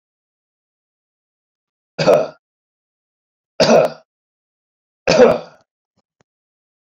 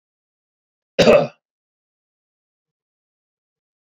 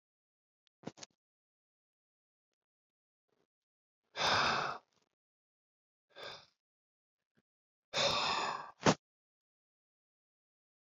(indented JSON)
{
  "three_cough_length": "7.0 s",
  "three_cough_amplitude": 32767,
  "three_cough_signal_mean_std_ratio": 0.28,
  "cough_length": "3.8 s",
  "cough_amplitude": 32768,
  "cough_signal_mean_std_ratio": 0.21,
  "exhalation_length": "10.8 s",
  "exhalation_amplitude": 7388,
  "exhalation_signal_mean_std_ratio": 0.28,
  "survey_phase": "beta (2021-08-13 to 2022-03-07)",
  "age": "65+",
  "gender": "Male",
  "wearing_mask": "No",
  "symptom_none": true,
  "smoker_status": "Ex-smoker",
  "respiratory_condition_asthma": false,
  "respiratory_condition_other": false,
  "recruitment_source": "REACT",
  "submission_delay": "2 days",
  "covid_test_result": "Negative",
  "covid_test_method": "RT-qPCR"
}